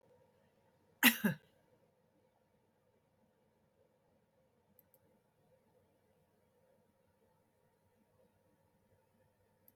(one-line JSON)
{"cough_length": "9.8 s", "cough_amplitude": 8882, "cough_signal_mean_std_ratio": 0.13, "survey_phase": "alpha (2021-03-01 to 2021-08-12)", "age": "65+", "gender": "Female", "wearing_mask": "No", "symptom_none": true, "symptom_onset": "6 days", "smoker_status": "Never smoked", "respiratory_condition_asthma": false, "respiratory_condition_other": false, "recruitment_source": "REACT", "submission_delay": "1 day", "covid_test_result": "Negative", "covid_test_method": "RT-qPCR"}